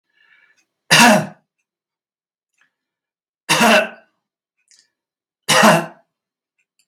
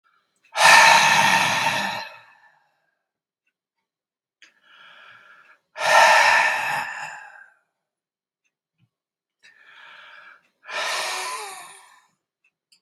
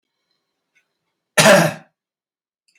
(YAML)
three_cough_length: 6.9 s
three_cough_amplitude: 32768
three_cough_signal_mean_std_ratio: 0.31
exhalation_length: 12.8 s
exhalation_amplitude: 32729
exhalation_signal_mean_std_ratio: 0.38
cough_length: 2.8 s
cough_amplitude: 32768
cough_signal_mean_std_ratio: 0.27
survey_phase: beta (2021-08-13 to 2022-03-07)
age: 65+
gender: Male
wearing_mask: 'No'
symptom_none: true
smoker_status: Never smoked
respiratory_condition_asthma: false
respiratory_condition_other: false
recruitment_source: REACT
submission_delay: 2 days
covid_test_result: Negative
covid_test_method: RT-qPCR